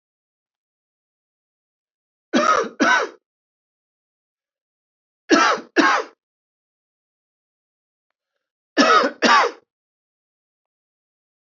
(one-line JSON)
{"three_cough_length": "11.5 s", "three_cough_amplitude": 28048, "three_cough_signal_mean_std_ratio": 0.31, "survey_phase": "beta (2021-08-13 to 2022-03-07)", "age": "45-64", "gender": "Male", "wearing_mask": "No", "symptom_none": true, "smoker_status": "Never smoked", "respiratory_condition_asthma": false, "respiratory_condition_other": false, "recruitment_source": "REACT", "submission_delay": "1 day", "covid_test_result": "Negative", "covid_test_method": "RT-qPCR"}